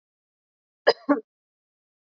cough_length: 2.1 s
cough_amplitude: 21617
cough_signal_mean_std_ratio: 0.19
survey_phase: beta (2021-08-13 to 2022-03-07)
age: 18-44
gender: Female
wearing_mask: 'No'
symptom_none: true
smoker_status: Never smoked
respiratory_condition_asthma: false
respiratory_condition_other: false
recruitment_source: REACT
submission_delay: 1 day
covid_test_result: Negative
covid_test_method: RT-qPCR
influenza_a_test_result: Unknown/Void
influenza_b_test_result: Unknown/Void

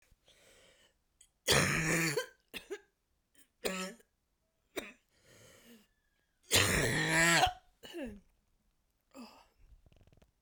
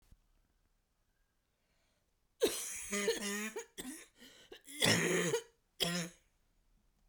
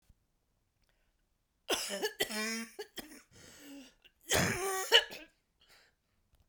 three_cough_length: 10.4 s
three_cough_amplitude: 8252
three_cough_signal_mean_std_ratio: 0.38
cough_length: 7.1 s
cough_amplitude: 5546
cough_signal_mean_std_ratio: 0.43
exhalation_length: 6.5 s
exhalation_amplitude: 10916
exhalation_signal_mean_std_ratio: 0.37
survey_phase: beta (2021-08-13 to 2022-03-07)
age: 45-64
gender: Female
wearing_mask: 'No'
symptom_cough_any: true
symptom_runny_or_blocked_nose: true
symptom_fatigue: true
symptom_fever_high_temperature: true
symptom_onset: 3 days
smoker_status: Never smoked
respiratory_condition_asthma: false
respiratory_condition_other: false
recruitment_source: Test and Trace
submission_delay: 1 day
covid_test_result: Positive
covid_test_method: RT-qPCR
covid_ct_value: 16.8
covid_ct_gene: ORF1ab gene
covid_ct_mean: 17.2
covid_viral_load: 2300000 copies/ml
covid_viral_load_category: High viral load (>1M copies/ml)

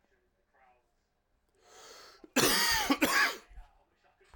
cough_length: 4.4 s
cough_amplitude: 7580
cough_signal_mean_std_ratio: 0.4
survey_phase: alpha (2021-03-01 to 2021-08-12)
age: 45-64
gender: Male
wearing_mask: 'Yes'
symptom_cough_any: true
symptom_shortness_of_breath: true
symptom_abdominal_pain: true
symptom_fatigue: true
symptom_fever_high_temperature: true
symptom_headache: true
symptom_change_to_sense_of_smell_or_taste: true
symptom_loss_of_taste: true
smoker_status: Ex-smoker
respiratory_condition_asthma: false
respiratory_condition_other: false
recruitment_source: Test and Trace
submission_delay: 5 days
covid_test_result: Negative
covid_test_method: RT-qPCR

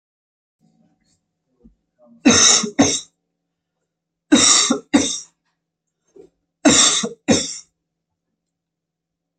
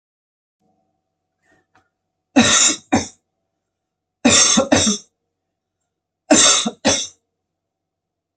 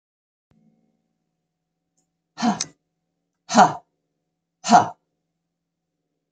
three_cough_length: 9.4 s
three_cough_amplitude: 32767
three_cough_signal_mean_std_ratio: 0.36
cough_length: 8.4 s
cough_amplitude: 32767
cough_signal_mean_std_ratio: 0.37
exhalation_length: 6.3 s
exhalation_amplitude: 28763
exhalation_signal_mean_std_ratio: 0.21
survey_phase: beta (2021-08-13 to 2022-03-07)
age: 45-64
gender: Female
wearing_mask: 'No'
symptom_runny_or_blocked_nose: true
symptom_fatigue: true
symptom_onset: 3 days
smoker_status: Never smoked
respiratory_condition_asthma: false
respiratory_condition_other: false
recruitment_source: Test and Trace
submission_delay: 2 days
covid_test_result: Positive
covid_test_method: RT-qPCR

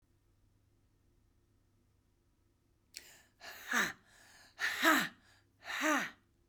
exhalation_length: 6.5 s
exhalation_amplitude: 6716
exhalation_signal_mean_std_ratio: 0.33
survey_phase: beta (2021-08-13 to 2022-03-07)
age: 45-64
gender: Female
wearing_mask: 'No'
symptom_cough_any: true
symptom_runny_or_blocked_nose: true
symptom_shortness_of_breath: true
symptom_sore_throat: true
symptom_fatigue: true
symptom_other: true
smoker_status: Never smoked
respiratory_condition_asthma: true
respiratory_condition_other: false
recruitment_source: Test and Trace
submission_delay: 1 day
covid_test_result: Positive
covid_test_method: ePCR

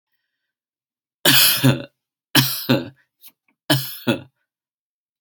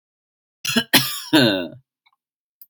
three_cough_length: 5.2 s
three_cough_amplitude: 32578
three_cough_signal_mean_std_ratio: 0.37
cough_length: 2.7 s
cough_amplitude: 32767
cough_signal_mean_std_ratio: 0.39
survey_phase: alpha (2021-03-01 to 2021-08-12)
age: 18-44
gender: Male
wearing_mask: 'No'
symptom_cough_any: true
symptom_shortness_of_breath: true
symptom_diarrhoea: true
symptom_fatigue: true
symptom_headache: true
symptom_change_to_sense_of_smell_or_taste: true
symptom_onset: 3 days
smoker_status: Never smoked
respiratory_condition_asthma: false
respiratory_condition_other: false
recruitment_source: Test and Trace
submission_delay: 1 day
covid_test_result: Positive
covid_test_method: RT-qPCR
covid_ct_value: 28.4
covid_ct_gene: N gene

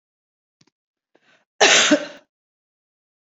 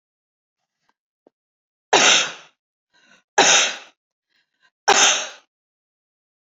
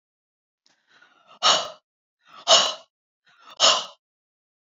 cough_length: 3.3 s
cough_amplitude: 28404
cough_signal_mean_std_ratio: 0.28
three_cough_length: 6.6 s
three_cough_amplitude: 30027
three_cough_signal_mean_std_ratio: 0.32
exhalation_length: 4.8 s
exhalation_amplitude: 26533
exhalation_signal_mean_std_ratio: 0.3
survey_phase: beta (2021-08-13 to 2022-03-07)
age: 45-64
gender: Female
wearing_mask: 'No'
symptom_none: true
smoker_status: Ex-smoker
respiratory_condition_asthma: false
respiratory_condition_other: false
recruitment_source: REACT
submission_delay: 3 days
covid_test_result: Negative
covid_test_method: RT-qPCR
influenza_a_test_result: Negative
influenza_b_test_result: Negative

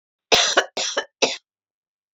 cough_length: 2.1 s
cough_amplitude: 29364
cough_signal_mean_std_ratio: 0.41
survey_phase: alpha (2021-03-01 to 2021-08-12)
age: 45-64
gender: Female
wearing_mask: 'No'
symptom_cough_any: true
symptom_fatigue: true
symptom_change_to_sense_of_smell_or_taste: true
symptom_onset: 5 days
smoker_status: Never smoked
respiratory_condition_asthma: false
respiratory_condition_other: false
recruitment_source: Test and Trace
submission_delay: 2 days
covid_test_result: Positive
covid_test_method: RT-qPCR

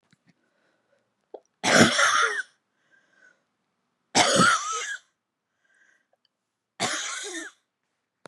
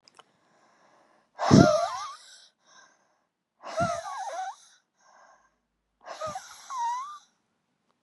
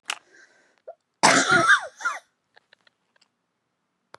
three_cough_length: 8.3 s
three_cough_amplitude: 24291
three_cough_signal_mean_std_ratio: 0.37
exhalation_length: 8.0 s
exhalation_amplitude: 27146
exhalation_signal_mean_std_ratio: 0.31
cough_length: 4.2 s
cough_amplitude: 23658
cough_signal_mean_std_ratio: 0.33
survey_phase: beta (2021-08-13 to 2022-03-07)
age: 45-64
gender: Female
wearing_mask: 'No'
symptom_none: true
smoker_status: Never smoked
respiratory_condition_asthma: true
respiratory_condition_other: false
recruitment_source: REACT
submission_delay: 2 days
covid_test_result: Negative
covid_test_method: RT-qPCR
influenza_a_test_result: Negative
influenza_b_test_result: Negative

